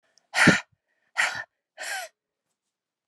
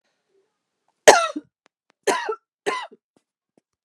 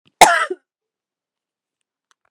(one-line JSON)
{"exhalation_length": "3.1 s", "exhalation_amplitude": 24437, "exhalation_signal_mean_std_ratio": 0.31, "three_cough_length": "3.8 s", "three_cough_amplitude": 32768, "three_cough_signal_mean_std_ratio": 0.24, "cough_length": "2.3 s", "cough_amplitude": 32768, "cough_signal_mean_std_ratio": 0.23, "survey_phase": "beta (2021-08-13 to 2022-03-07)", "age": "45-64", "gender": "Female", "wearing_mask": "No", "symptom_cough_any": true, "symptom_runny_or_blocked_nose": true, "symptom_shortness_of_breath": true, "symptom_fatigue": true, "symptom_onset": "7 days", "smoker_status": "Ex-smoker", "respiratory_condition_asthma": false, "respiratory_condition_other": false, "recruitment_source": "Test and Trace", "submission_delay": "2 days", "covid_test_result": "Positive", "covid_test_method": "RT-qPCR"}